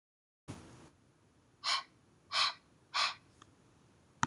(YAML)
exhalation_length: 4.3 s
exhalation_amplitude: 8066
exhalation_signal_mean_std_ratio: 0.33
survey_phase: beta (2021-08-13 to 2022-03-07)
age: 18-44
gender: Female
wearing_mask: 'No'
symptom_none: true
smoker_status: Never smoked
respiratory_condition_asthma: false
respiratory_condition_other: false
recruitment_source: REACT
submission_delay: 3 days
covid_test_result: Negative
covid_test_method: RT-qPCR